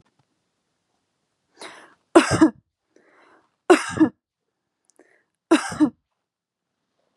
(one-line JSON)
{"three_cough_length": "7.2 s", "three_cough_amplitude": 32067, "three_cough_signal_mean_std_ratio": 0.25, "survey_phase": "beta (2021-08-13 to 2022-03-07)", "age": "18-44", "gender": "Female", "wearing_mask": "No", "symptom_none": true, "symptom_onset": "8 days", "smoker_status": "Never smoked", "respiratory_condition_asthma": false, "respiratory_condition_other": false, "recruitment_source": "REACT", "submission_delay": "2 days", "covid_test_result": "Negative", "covid_test_method": "RT-qPCR", "influenza_a_test_result": "Negative", "influenza_b_test_result": "Negative"}